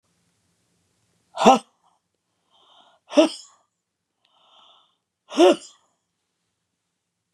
{"exhalation_length": "7.3 s", "exhalation_amplitude": 32767, "exhalation_signal_mean_std_ratio": 0.21, "survey_phase": "beta (2021-08-13 to 2022-03-07)", "age": "65+", "gender": "Female", "wearing_mask": "No", "symptom_headache": true, "smoker_status": "Never smoked", "respiratory_condition_asthma": false, "respiratory_condition_other": false, "recruitment_source": "REACT", "submission_delay": "2 days", "covid_test_result": "Negative", "covid_test_method": "RT-qPCR", "influenza_a_test_result": "Negative", "influenza_b_test_result": "Negative"}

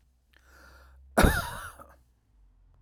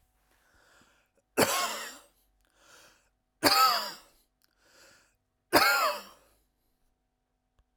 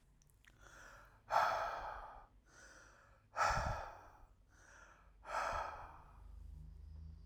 {"cough_length": "2.8 s", "cough_amplitude": 14638, "cough_signal_mean_std_ratio": 0.28, "three_cough_length": "7.8 s", "three_cough_amplitude": 15781, "three_cough_signal_mean_std_ratio": 0.32, "exhalation_length": "7.3 s", "exhalation_amplitude": 3090, "exhalation_signal_mean_std_ratio": 0.49, "survey_phase": "alpha (2021-03-01 to 2021-08-12)", "age": "45-64", "gender": "Male", "wearing_mask": "No", "symptom_none": true, "smoker_status": "Never smoked", "respiratory_condition_asthma": false, "respiratory_condition_other": false, "recruitment_source": "REACT", "submission_delay": "3 days", "covid_test_result": "Negative", "covid_test_method": "RT-qPCR"}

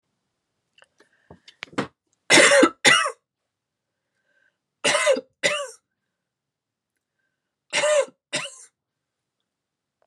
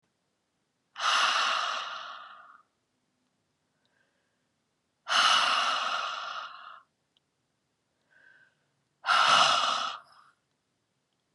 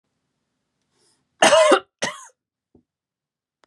{"three_cough_length": "10.1 s", "three_cough_amplitude": 30747, "three_cough_signal_mean_std_ratio": 0.31, "exhalation_length": "11.3 s", "exhalation_amplitude": 11211, "exhalation_signal_mean_std_ratio": 0.43, "cough_length": "3.7 s", "cough_amplitude": 30175, "cough_signal_mean_std_ratio": 0.28, "survey_phase": "beta (2021-08-13 to 2022-03-07)", "age": "18-44", "gender": "Female", "wearing_mask": "No", "symptom_runny_or_blocked_nose": true, "symptom_fatigue": true, "symptom_headache": true, "symptom_change_to_sense_of_smell_or_taste": true, "symptom_onset": "3 days", "smoker_status": "Never smoked", "respiratory_condition_asthma": false, "respiratory_condition_other": false, "recruitment_source": "Test and Trace", "submission_delay": "2 days", "covid_test_result": "Positive", "covid_test_method": "RT-qPCR", "covid_ct_value": 20.6, "covid_ct_gene": "ORF1ab gene", "covid_ct_mean": 21.2, "covid_viral_load": "110000 copies/ml", "covid_viral_load_category": "Low viral load (10K-1M copies/ml)"}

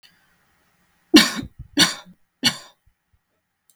{"three_cough_length": "3.8 s", "three_cough_amplitude": 32768, "three_cough_signal_mean_std_ratio": 0.25, "survey_phase": "beta (2021-08-13 to 2022-03-07)", "age": "18-44", "gender": "Female", "wearing_mask": "No", "symptom_runny_or_blocked_nose": true, "symptom_fatigue": true, "symptom_headache": true, "smoker_status": "Ex-smoker", "respiratory_condition_asthma": false, "respiratory_condition_other": false, "recruitment_source": "Test and Trace", "submission_delay": "1 day", "covid_test_result": "Positive", "covid_test_method": "RT-qPCR", "covid_ct_value": 27.3, "covid_ct_gene": "N gene"}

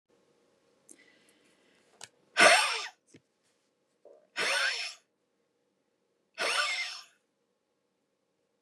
{"exhalation_length": "8.6 s", "exhalation_amplitude": 15472, "exhalation_signal_mean_std_ratio": 0.29, "survey_phase": "beta (2021-08-13 to 2022-03-07)", "age": "65+", "gender": "Female", "wearing_mask": "No", "symptom_none": true, "smoker_status": "Ex-smoker", "respiratory_condition_asthma": false, "respiratory_condition_other": false, "recruitment_source": "REACT", "submission_delay": "2 days", "covid_test_result": "Negative", "covid_test_method": "RT-qPCR"}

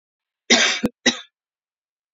{"cough_length": "2.1 s", "cough_amplitude": 30117, "cough_signal_mean_std_ratio": 0.34, "survey_phase": "beta (2021-08-13 to 2022-03-07)", "age": "18-44", "gender": "Female", "wearing_mask": "No", "symptom_none": true, "smoker_status": "Ex-smoker", "respiratory_condition_asthma": false, "respiratory_condition_other": false, "recruitment_source": "REACT", "submission_delay": "3 days", "covid_test_result": "Negative", "covid_test_method": "RT-qPCR", "influenza_a_test_result": "Negative", "influenza_b_test_result": "Negative"}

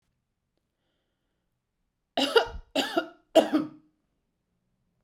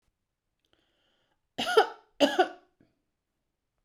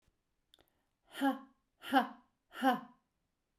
{"three_cough_length": "5.0 s", "three_cough_amplitude": 16813, "three_cough_signal_mean_std_ratio": 0.28, "cough_length": "3.8 s", "cough_amplitude": 13411, "cough_signal_mean_std_ratio": 0.25, "exhalation_length": "3.6 s", "exhalation_amplitude": 5160, "exhalation_signal_mean_std_ratio": 0.32, "survey_phase": "beta (2021-08-13 to 2022-03-07)", "age": "45-64", "gender": "Female", "wearing_mask": "No", "symptom_none": true, "smoker_status": "Never smoked", "respiratory_condition_asthma": true, "respiratory_condition_other": false, "recruitment_source": "REACT", "submission_delay": "1 day", "covid_test_result": "Negative", "covid_test_method": "RT-qPCR"}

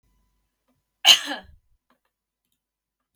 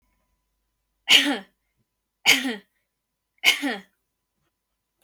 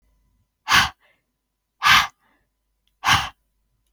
{"cough_length": "3.2 s", "cough_amplitude": 32768, "cough_signal_mean_std_ratio": 0.18, "three_cough_length": "5.0 s", "three_cough_amplitude": 28563, "three_cough_signal_mean_std_ratio": 0.29, "exhalation_length": "3.9 s", "exhalation_amplitude": 25632, "exhalation_signal_mean_std_ratio": 0.31, "survey_phase": "beta (2021-08-13 to 2022-03-07)", "age": "18-44", "gender": "Female", "wearing_mask": "No", "symptom_none": true, "smoker_status": "Never smoked", "respiratory_condition_asthma": false, "respiratory_condition_other": false, "recruitment_source": "REACT", "submission_delay": "2 days", "covid_test_result": "Negative", "covid_test_method": "RT-qPCR", "influenza_a_test_result": "Negative", "influenza_b_test_result": "Negative"}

